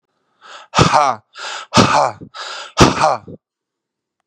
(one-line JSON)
{"exhalation_length": "4.3 s", "exhalation_amplitude": 32768, "exhalation_signal_mean_std_ratio": 0.43, "survey_phase": "beta (2021-08-13 to 2022-03-07)", "age": "18-44", "gender": "Male", "wearing_mask": "No", "symptom_cough_any": true, "symptom_runny_or_blocked_nose": true, "symptom_shortness_of_breath": true, "symptom_sore_throat": true, "symptom_abdominal_pain": true, "symptom_fatigue": true, "symptom_headache": true, "symptom_change_to_sense_of_smell_or_taste": true, "symptom_loss_of_taste": true, "symptom_onset": "4 days", "smoker_status": "Current smoker (11 or more cigarettes per day)", "respiratory_condition_asthma": true, "respiratory_condition_other": false, "recruitment_source": "Test and Trace", "submission_delay": "2 days", "covid_test_result": "Positive", "covid_test_method": "ePCR"}